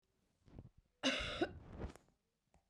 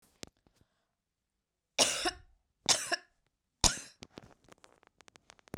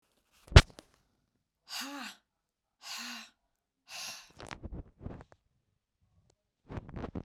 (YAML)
cough_length: 2.7 s
cough_amplitude: 2347
cough_signal_mean_std_ratio: 0.4
three_cough_length: 5.6 s
three_cough_amplitude: 17009
three_cough_signal_mean_std_ratio: 0.25
exhalation_length: 7.2 s
exhalation_amplitude: 28447
exhalation_signal_mean_std_ratio: 0.16
survey_phase: beta (2021-08-13 to 2022-03-07)
age: 45-64
gender: Female
wearing_mask: 'No'
symptom_none: true
smoker_status: Never smoked
respiratory_condition_asthma: false
respiratory_condition_other: false
recruitment_source: Test and Trace
submission_delay: 2 days
covid_test_result: Positive
covid_test_method: LAMP